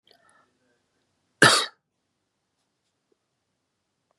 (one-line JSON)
{"cough_length": "4.2 s", "cough_amplitude": 30461, "cough_signal_mean_std_ratio": 0.17, "survey_phase": "beta (2021-08-13 to 2022-03-07)", "age": "18-44", "gender": "Male", "wearing_mask": "No", "symptom_none": true, "smoker_status": "Current smoker (1 to 10 cigarettes per day)", "respiratory_condition_asthma": false, "respiratory_condition_other": false, "recruitment_source": "REACT", "submission_delay": "1 day", "covid_test_result": "Negative", "covid_test_method": "RT-qPCR", "influenza_a_test_result": "Negative", "influenza_b_test_result": "Negative"}